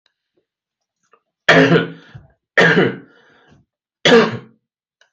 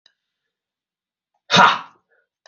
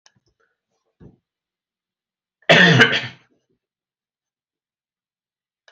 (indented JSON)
{
  "three_cough_length": "5.1 s",
  "three_cough_amplitude": 31207,
  "three_cough_signal_mean_std_ratio": 0.37,
  "exhalation_length": "2.5 s",
  "exhalation_amplitude": 30448,
  "exhalation_signal_mean_std_ratio": 0.25,
  "cough_length": "5.7 s",
  "cough_amplitude": 30925,
  "cough_signal_mean_std_ratio": 0.24,
  "survey_phase": "beta (2021-08-13 to 2022-03-07)",
  "age": "18-44",
  "gender": "Male",
  "wearing_mask": "No",
  "symptom_none": true,
  "smoker_status": "Never smoked",
  "respiratory_condition_asthma": false,
  "respiratory_condition_other": false,
  "recruitment_source": "REACT",
  "submission_delay": "1 day",
  "covid_test_result": "Negative",
  "covid_test_method": "RT-qPCR"
}